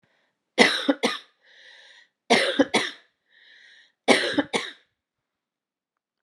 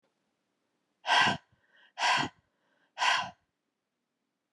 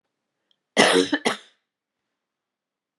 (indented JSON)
{
  "three_cough_length": "6.2 s",
  "three_cough_amplitude": 32375,
  "three_cough_signal_mean_std_ratio": 0.34,
  "exhalation_length": "4.5 s",
  "exhalation_amplitude": 8536,
  "exhalation_signal_mean_std_ratio": 0.35,
  "cough_length": "3.0 s",
  "cough_amplitude": 29659,
  "cough_signal_mean_std_ratio": 0.3,
  "survey_phase": "beta (2021-08-13 to 2022-03-07)",
  "age": "45-64",
  "gender": "Female",
  "wearing_mask": "No",
  "symptom_cough_any": true,
  "symptom_runny_or_blocked_nose": true,
  "symptom_diarrhoea": true,
  "symptom_onset": "5 days",
  "smoker_status": "Ex-smoker",
  "respiratory_condition_asthma": false,
  "respiratory_condition_other": false,
  "recruitment_source": "Test and Trace",
  "submission_delay": "2 days",
  "covid_test_result": "Positive",
  "covid_test_method": "RT-qPCR"
}